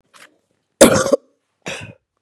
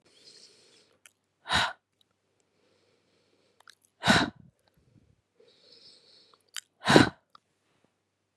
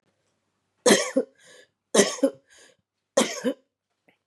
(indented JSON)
{
  "cough_length": "2.2 s",
  "cough_amplitude": 32768,
  "cough_signal_mean_std_ratio": 0.3,
  "exhalation_length": "8.4 s",
  "exhalation_amplitude": 30863,
  "exhalation_signal_mean_std_ratio": 0.21,
  "three_cough_length": "4.3 s",
  "three_cough_amplitude": 25764,
  "three_cough_signal_mean_std_ratio": 0.33,
  "survey_phase": "beta (2021-08-13 to 2022-03-07)",
  "age": "45-64",
  "gender": "Female",
  "wearing_mask": "No",
  "symptom_cough_any": true,
  "symptom_runny_or_blocked_nose": true,
  "symptom_sore_throat": true,
  "symptom_fatigue": true,
  "symptom_fever_high_temperature": true,
  "symptom_headache": true,
  "symptom_change_to_sense_of_smell_or_taste": true,
  "symptom_onset": "5 days",
  "smoker_status": "Ex-smoker",
  "respiratory_condition_asthma": false,
  "respiratory_condition_other": false,
  "recruitment_source": "Test and Trace",
  "submission_delay": "2 days",
  "covid_test_result": "Positive",
  "covid_test_method": "RT-qPCR",
  "covid_ct_value": 18.8,
  "covid_ct_gene": "ORF1ab gene",
  "covid_ct_mean": 19.0,
  "covid_viral_load": "580000 copies/ml",
  "covid_viral_load_category": "Low viral load (10K-1M copies/ml)"
}